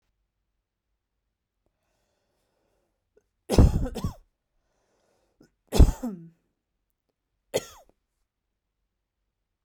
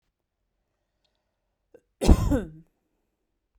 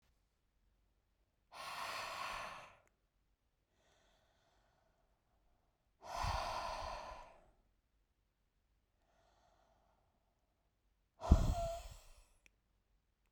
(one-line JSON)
{"three_cough_length": "9.6 s", "three_cough_amplitude": 28964, "three_cough_signal_mean_std_ratio": 0.19, "cough_length": "3.6 s", "cough_amplitude": 27199, "cough_signal_mean_std_ratio": 0.23, "exhalation_length": "13.3 s", "exhalation_amplitude": 7919, "exhalation_signal_mean_std_ratio": 0.28, "survey_phase": "beta (2021-08-13 to 2022-03-07)", "age": "18-44", "gender": "Female", "wearing_mask": "No", "symptom_none": true, "smoker_status": "Ex-smoker", "respiratory_condition_asthma": false, "respiratory_condition_other": false, "recruitment_source": "REACT", "submission_delay": "0 days", "covid_test_result": "Negative", "covid_test_method": "RT-qPCR"}